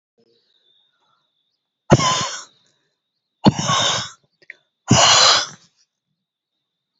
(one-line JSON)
{"exhalation_length": "7.0 s", "exhalation_amplitude": 31216, "exhalation_signal_mean_std_ratio": 0.35, "survey_phase": "beta (2021-08-13 to 2022-03-07)", "age": "45-64", "gender": "Female", "wearing_mask": "No", "symptom_none": true, "smoker_status": "Never smoked", "respiratory_condition_asthma": true, "respiratory_condition_other": false, "recruitment_source": "REACT", "submission_delay": "1 day", "covid_test_result": "Negative", "covid_test_method": "RT-qPCR"}